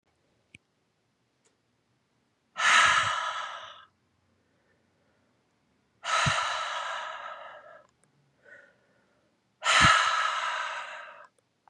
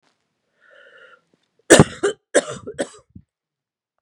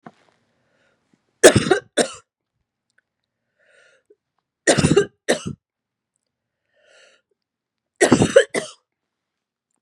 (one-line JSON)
{"exhalation_length": "11.7 s", "exhalation_amplitude": 14717, "exhalation_signal_mean_std_ratio": 0.4, "cough_length": "4.0 s", "cough_amplitude": 32768, "cough_signal_mean_std_ratio": 0.23, "three_cough_length": "9.8 s", "three_cough_amplitude": 32768, "three_cough_signal_mean_std_ratio": 0.25, "survey_phase": "beta (2021-08-13 to 2022-03-07)", "age": "45-64", "gender": "Female", "wearing_mask": "No", "symptom_cough_any": true, "symptom_runny_or_blocked_nose": true, "symptom_sore_throat": true, "symptom_fatigue": true, "symptom_headache": true, "symptom_change_to_sense_of_smell_or_taste": true, "symptom_onset": "7 days", "smoker_status": "Never smoked", "respiratory_condition_asthma": false, "respiratory_condition_other": false, "recruitment_source": "Test and Trace", "submission_delay": "3 days", "covid_test_result": "Positive", "covid_test_method": "RT-qPCR", "covid_ct_value": 20.4, "covid_ct_gene": "ORF1ab gene", "covid_ct_mean": 20.8, "covid_viral_load": "150000 copies/ml", "covid_viral_load_category": "Low viral load (10K-1M copies/ml)"}